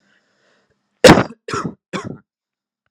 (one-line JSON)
{"cough_length": "2.9 s", "cough_amplitude": 32768, "cough_signal_mean_std_ratio": 0.25, "survey_phase": "beta (2021-08-13 to 2022-03-07)", "age": "18-44", "gender": "Male", "wearing_mask": "No", "symptom_none": true, "symptom_onset": "13 days", "smoker_status": "Current smoker (e-cigarettes or vapes only)", "respiratory_condition_asthma": false, "respiratory_condition_other": false, "recruitment_source": "REACT", "submission_delay": "1 day", "covid_test_result": "Negative", "covid_test_method": "RT-qPCR", "influenza_a_test_result": "Negative", "influenza_b_test_result": "Negative"}